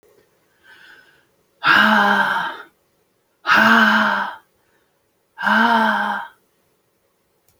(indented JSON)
{
  "exhalation_length": "7.6 s",
  "exhalation_amplitude": 29040,
  "exhalation_signal_mean_std_ratio": 0.49,
  "survey_phase": "beta (2021-08-13 to 2022-03-07)",
  "age": "45-64",
  "gender": "Female",
  "wearing_mask": "No",
  "symptom_none": true,
  "smoker_status": "Ex-smoker",
  "respiratory_condition_asthma": false,
  "respiratory_condition_other": false,
  "recruitment_source": "REACT",
  "submission_delay": "2 days",
  "covid_test_result": "Negative",
  "covid_test_method": "RT-qPCR"
}